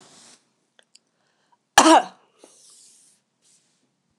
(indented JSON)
{
  "cough_length": "4.2 s",
  "cough_amplitude": 29204,
  "cough_signal_mean_std_ratio": 0.2,
  "survey_phase": "beta (2021-08-13 to 2022-03-07)",
  "age": "45-64",
  "gender": "Female",
  "wearing_mask": "No",
  "symptom_runny_or_blocked_nose": true,
  "smoker_status": "Never smoked",
  "respiratory_condition_asthma": false,
  "respiratory_condition_other": false,
  "recruitment_source": "REACT",
  "submission_delay": "1 day",
  "covid_test_result": "Negative",
  "covid_test_method": "RT-qPCR",
  "influenza_a_test_result": "Negative",
  "influenza_b_test_result": "Negative"
}